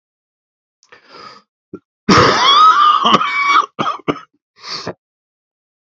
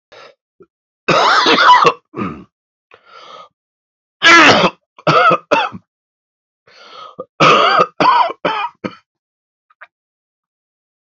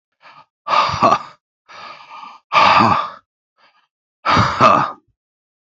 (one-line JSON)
{"cough_length": "6.0 s", "cough_amplitude": 31826, "cough_signal_mean_std_ratio": 0.47, "three_cough_length": "11.0 s", "three_cough_amplitude": 32768, "three_cough_signal_mean_std_ratio": 0.44, "exhalation_length": "5.6 s", "exhalation_amplitude": 32767, "exhalation_signal_mean_std_ratio": 0.46, "survey_phase": "beta (2021-08-13 to 2022-03-07)", "age": "45-64", "gender": "Male", "wearing_mask": "No", "symptom_cough_any": true, "symptom_new_continuous_cough": true, "symptom_runny_or_blocked_nose": true, "symptom_shortness_of_breath": true, "symptom_sore_throat": true, "symptom_fatigue": true, "symptom_fever_high_temperature": true, "symptom_headache": true, "symptom_onset": "5 days", "smoker_status": "Current smoker (1 to 10 cigarettes per day)", "respiratory_condition_asthma": false, "respiratory_condition_other": false, "recruitment_source": "Test and Trace", "submission_delay": "2 days", "covid_test_result": "Positive", "covid_test_method": "RT-qPCR", "covid_ct_value": 15.6, "covid_ct_gene": "ORF1ab gene", "covid_ct_mean": 16.0, "covid_viral_load": "5700000 copies/ml", "covid_viral_load_category": "High viral load (>1M copies/ml)"}